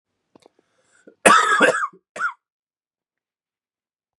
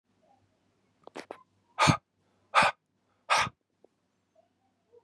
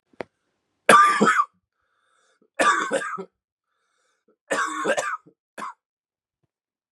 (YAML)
cough_length: 4.2 s
cough_amplitude: 32768
cough_signal_mean_std_ratio: 0.31
exhalation_length: 5.0 s
exhalation_amplitude: 13109
exhalation_signal_mean_std_ratio: 0.26
three_cough_length: 6.9 s
three_cough_amplitude: 32391
three_cough_signal_mean_std_ratio: 0.36
survey_phase: beta (2021-08-13 to 2022-03-07)
age: 18-44
gender: Male
wearing_mask: 'No'
symptom_new_continuous_cough: true
symptom_runny_or_blocked_nose: true
symptom_shortness_of_breath: true
symptom_sore_throat: true
symptom_fatigue: true
symptom_headache: true
symptom_change_to_sense_of_smell_or_taste: true
symptom_other: true
smoker_status: Ex-smoker
respiratory_condition_asthma: false
respiratory_condition_other: false
recruitment_source: Test and Trace
submission_delay: 2 days
covid_test_result: Positive
covid_test_method: RT-qPCR
covid_ct_value: 28.4
covid_ct_gene: ORF1ab gene